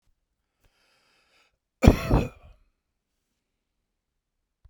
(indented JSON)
{
  "cough_length": "4.7 s",
  "cough_amplitude": 32767,
  "cough_signal_mean_std_ratio": 0.18,
  "survey_phase": "beta (2021-08-13 to 2022-03-07)",
  "age": "65+",
  "gender": "Male",
  "wearing_mask": "No",
  "symptom_none": true,
  "smoker_status": "Never smoked",
  "respiratory_condition_asthma": false,
  "respiratory_condition_other": false,
  "recruitment_source": "REACT",
  "submission_delay": "2 days",
  "covid_test_result": "Negative",
  "covid_test_method": "RT-qPCR"
}